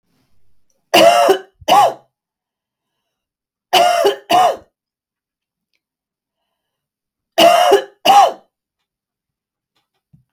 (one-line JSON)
{"three_cough_length": "10.3 s", "three_cough_amplitude": 32768, "three_cough_signal_mean_std_ratio": 0.38, "survey_phase": "beta (2021-08-13 to 2022-03-07)", "age": "45-64", "gender": "Female", "wearing_mask": "No", "symptom_none": true, "smoker_status": "Never smoked", "respiratory_condition_asthma": false, "respiratory_condition_other": false, "recruitment_source": "REACT", "submission_delay": "3 days", "covid_test_result": "Negative", "covid_test_method": "RT-qPCR", "influenza_a_test_result": "Negative", "influenza_b_test_result": "Negative"}